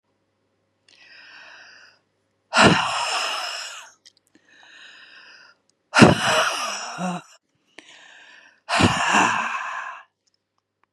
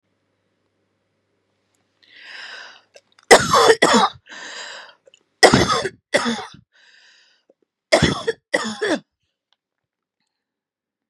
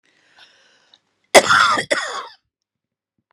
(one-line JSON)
{"exhalation_length": "10.9 s", "exhalation_amplitude": 32768, "exhalation_signal_mean_std_ratio": 0.39, "three_cough_length": "11.1 s", "three_cough_amplitude": 32768, "three_cough_signal_mean_std_ratio": 0.32, "cough_length": "3.3 s", "cough_amplitude": 32768, "cough_signal_mean_std_ratio": 0.32, "survey_phase": "beta (2021-08-13 to 2022-03-07)", "age": "45-64", "gender": "Female", "wearing_mask": "No", "symptom_fatigue": true, "smoker_status": "Never smoked", "respiratory_condition_asthma": false, "respiratory_condition_other": false, "recruitment_source": "REACT", "submission_delay": "-2 days", "covid_test_result": "Negative", "covid_test_method": "RT-qPCR", "influenza_a_test_result": "Negative", "influenza_b_test_result": "Negative"}